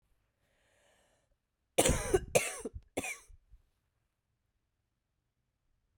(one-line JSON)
{"cough_length": "6.0 s", "cough_amplitude": 9669, "cough_signal_mean_std_ratio": 0.26, "survey_phase": "beta (2021-08-13 to 2022-03-07)", "age": "45-64", "gender": "Female", "wearing_mask": "No", "symptom_cough_any": true, "symptom_runny_or_blocked_nose": true, "symptom_sore_throat": true, "symptom_fatigue": true, "symptom_fever_high_temperature": true, "symptom_headache": true, "symptom_change_to_sense_of_smell_or_taste": true, "symptom_other": true, "symptom_onset": "3 days", "smoker_status": "Ex-smoker", "respiratory_condition_asthma": false, "respiratory_condition_other": false, "recruitment_source": "Test and Trace", "submission_delay": "2 days", "covid_test_result": "Positive", "covid_test_method": "RT-qPCR", "covid_ct_value": 16.3, "covid_ct_gene": "ORF1ab gene", "covid_ct_mean": 16.7, "covid_viral_load": "3200000 copies/ml", "covid_viral_load_category": "High viral load (>1M copies/ml)"}